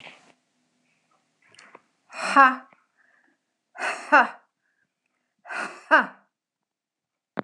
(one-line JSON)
{"exhalation_length": "7.4 s", "exhalation_amplitude": 25721, "exhalation_signal_mean_std_ratio": 0.24, "survey_phase": "beta (2021-08-13 to 2022-03-07)", "age": "45-64", "gender": "Female", "wearing_mask": "Yes", "symptom_none": true, "smoker_status": "Never smoked", "respiratory_condition_asthma": false, "respiratory_condition_other": false, "recruitment_source": "REACT", "submission_delay": "3 days", "covid_test_result": "Negative", "covid_test_method": "RT-qPCR"}